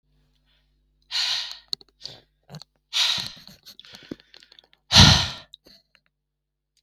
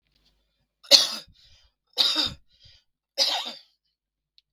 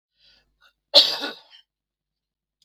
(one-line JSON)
{"exhalation_length": "6.8 s", "exhalation_amplitude": 32768, "exhalation_signal_mean_std_ratio": 0.27, "three_cough_length": "4.5 s", "three_cough_amplitude": 32766, "three_cough_signal_mean_std_ratio": 0.29, "cough_length": "2.6 s", "cough_amplitude": 32768, "cough_signal_mean_std_ratio": 0.22, "survey_phase": "beta (2021-08-13 to 2022-03-07)", "age": "45-64", "gender": "Male", "wearing_mask": "No", "symptom_none": true, "smoker_status": "Never smoked", "respiratory_condition_asthma": false, "respiratory_condition_other": false, "recruitment_source": "REACT", "submission_delay": "3 days", "covid_test_result": "Negative", "covid_test_method": "RT-qPCR", "influenza_a_test_result": "Negative", "influenza_b_test_result": "Negative"}